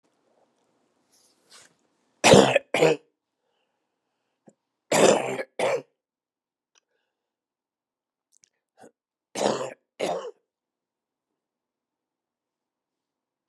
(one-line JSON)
{"three_cough_length": "13.5 s", "three_cough_amplitude": 32102, "three_cough_signal_mean_std_ratio": 0.24, "survey_phase": "beta (2021-08-13 to 2022-03-07)", "age": "65+", "gender": "Male", "wearing_mask": "No", "symptom_cough_any": true, "symptom_onset": "4 days", "smoker_status": "Never smoked", "respiratory_condition_asthma": false, "respiratory_condition_other": false, "recruitment_source": "Test and Trace", "submission_delay": "2 days", "covid_test_result": "Positive", "covid_test_method": "RT-qPCR", "covid_ct_value": 15.3, "covid_ct_gene": "ORF1ab gene", "covid_ct_mean": 15.6, "covid_viral_load": "7600000 copies/ml", "covid_viral_load_category": "High viral load (>1M copies/ml)"}